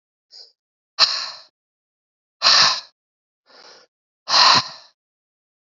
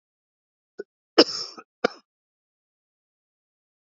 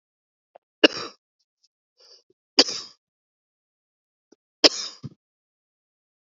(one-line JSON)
{"exhalation_length": "5.7 s", "exhalation_amplitude": 32583, "exhalation_signal_mean_std_ratio": 0.32, "cough_length": "3.9 s", "cough_amplitude": 30119, "cough_signal_mean_std_ratio": 0.15, "three_cough_length": "6.2 s", "three_cough_amplitude": 32768, "three_cough_signal_mean_std_ratio": 0.15, "survey_phase": "beta (2021-08-13 to 2022-03-07)", "age": "18-44", "gender": "Male", "wearing_mask": "No", "symptom_cough_any": true, "symptom_runny_or_blocked_nose": true, "symptom_shortness_of_breath": true, "symptom_abdominal_pain": true, "symptom_fatigue": true, "symptom_fever_high_temperature": true, "symptom_headache": true, "symptom_change_to_sense_of_smell_or_taste": true, "symptom_loss_of_taste": true, "symptom_onset": "4 days", "smoker_status": "Current smoker (1 to 10 cigarettes per day)", "respiratory_condition_asthma": false, "respiratory_condition_other": false, "recruitment_source": "Test and Trace", "submission_delay": "2 days", "covid_test_result": "Positive", "covid_test_method": "RT-qPCR", "covid_ct_value": 16.8, "covid_ct_gene": "ORF1ab gene", "covid_ct_mean": 17.6, "covid_viral_load": "1600000 copies/ml", "covid_viral_load_category": "High viral load (>1M copies/ml)"}